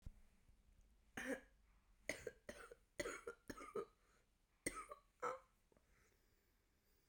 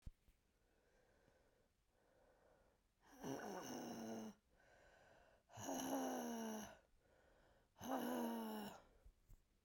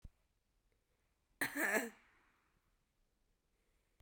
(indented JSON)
{
  "three_cough_length": "7.1 s",
  "three_cough_amplitude": 1181,
  "three_cough_signal_mean_std_ratio": 0.4,
  "exhalation_length": "9.6 s",
  "exhalation_amplitude": 764,
  "exhalation_signal_mean_std_ratio": 0.54,
  "cough_length": "4.0 s",
  "cough_amplitude": 2748,
  "cough_signal_mean_std_ratio": 0.27,
  "survey_phase": "beta (2021-08-13 to 2022-03-07)",
  "age": "18-44",
  "gender": "Female",
  "wearing_mask": "No",
  "symptom_cough_any": true,
  "symptom_sore_throat": true,
  "smoker_status": "Never smoked",
  "respiratory_condition_asthma": false,
  "respiratory_condition_other": false,
  "recruitment_source": "Test and Trace",
  "submission_delay": "1 day",
  "covid_test_result": "Positive",
  "covid_test_method": "RT-qPCR",
  "covid_ct_value": 31.2,
  "covid_ct_gene": "N gene",
  "covid_ct_mean": 31.7,
  "covid_viral_load": "41 copies/ml",
  "covid_viral_load_category": "Minimal viral load (< 10K copies/ml)"
}